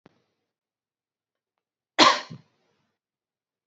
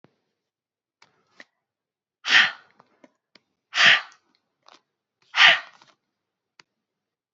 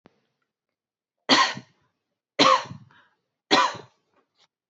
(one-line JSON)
{"cough_length": "3.7 s", "cough_amplitude": 25840, "cough_signal_mean_std_ratio": 0.18, "exhalation_length": "7.3 s", "exhalation_amplitude": 26384, "exhalation_signal_mean_std_ratio": 0.24, "three_cough_length": "4.7 s", "three_cough_amplitude": 26132, "three_cough_signal_mean_std_ratio": 0.3, "survey_phase": "beta (2021-08-13 to 2022-03-07)", "age": "18-44", "gender": "Female", "wearing_mask": "No", "symptom_headache": true, "smoker_status": "Never smoked", "respiratory_condition_asthma": false, "respiratory_condition_other": false, "recruitment_source": "REACT", "submission_delay": "1 day", "covid_test_result": "Negative", "covid_test_method": "RT-qPCR", "influenza_a_test_result": "Negative", "influenza_b_test_result": "Negative"}